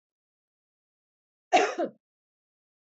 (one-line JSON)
{"cough_length": "3.0 s", "cough_amplitude": 10691, "cough_signal_mean_std_ratio": 0.23, "survey_phase": "alpha (2021-03-01 to 2021-08-12)", "age": "65+", "gender": "Female", "wearing_mask": "No", "symptom_cough_any": true, "symptom_onset": "12 days", "smoker_status": "Never smoked", "respiratory_condition_asthma": false, "respiratory_condition_other": false, "recruitment_source": "REACT", "submission_delay": "3 days", "covid_test_result": "Negative", "covid_test_method": "RT-qPCR"}